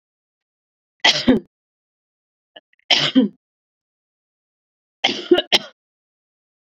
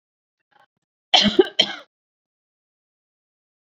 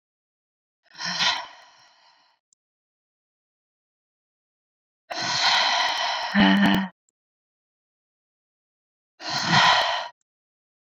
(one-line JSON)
{"three_cough_length": "6.7 s", "three_cough_amplitude": 31552, "three_cough_signal_mean_std_ratio": 0.28, "cough_length": "3.7 s", "cough_amplitude": 30590, "cough_signal_mean_std_ratio": 0.23, "exhalation_length": "10.8 s", "exhalation_amplitude": 18758, "exhalation_signal_mean_std_ratio": 0.41, "survey_phase": "beta (2021-08-13 to 2022-03-07)", "age": "45-64", "gender": "Female", "wearing_mask": "No", "symptom_none": true, "smoker_status": "Never smoked", "respiratory_condition_asthma": false, "respiratory_condition_other": false, "recruitment_source": "REACT", "submission_delay": "1 day", "covid_test_result": "Negative", "covid_test_method": "RT-qPCR"}